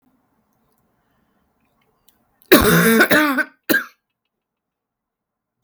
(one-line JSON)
{"cough_length": "5.6 s", "cough_amplitude": 32768, "cough_signal_mean_std_ratio": 0.34, "survey_phase": "beta (2021-08-13 to 2022-03-07)", "age": "45-64", "gender": "Female", "wearing_mask": "No", "symptom_cough_any": true, "symptom_runny_or_blocked_nose": true, "symptom_abdominal_pain": true, "symptom_fatigue": true, "symptom_headache": true, "symptom_change_to_sense_of_smell_or_taste": true, "symptom_onset": "3 days", "smoker_status": "Never smoked", "respiratory_condition_asthma": false, "respiratory_condition_other": false, "recruitment_source": "Test and Trace", "submission_delay": "2 days", "covid_test_result": "Positive", "covid_test_method": "RT-qPCR", "covid_ct_value": 20.8, "covid_ct_gene": "ORF1ab gene"}